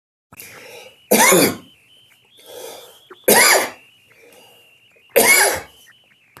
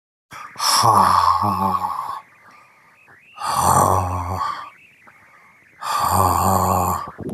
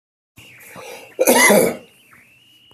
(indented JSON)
{
  "three_cough_length": "6.4 s",
  "three_cough_amplitude": 32768,
  "three_cough_signal_mean_std_ratio": 0.39,
  "exhalation_length": "7.3 s",
  "exhalation_amplitude": 25072,
  "exhalation_signal_mean_std_ratio": 0.66,
  "cough_length": "2.7 s",
  "cough_amplitude": 29636,
  "cough_signal_mean_std_ratio": 0.4,
  "survey_phase": "beta (2021-08-13 to 2022-03-07)",
  "age": "45-64",
  "gender": "Male",
  "wearing_mask": "No",
  "symptom_none": true,
  "smoker_status": "Current smoker (1 to 10 cigarettes per day)",
  "respiratory_condition_asthma": false,
  "respiratory_condition_other": false,
  "recruitment_source": "REACT",
  "submission_delay": "1 day",
  "covid_test_result": "Negative",
  "covid_test_method": "RT-qPCR",
  "influenza_a_test_result": "Unknown/Void",
  "influenza_b_test_result": "Unknown/Void"
}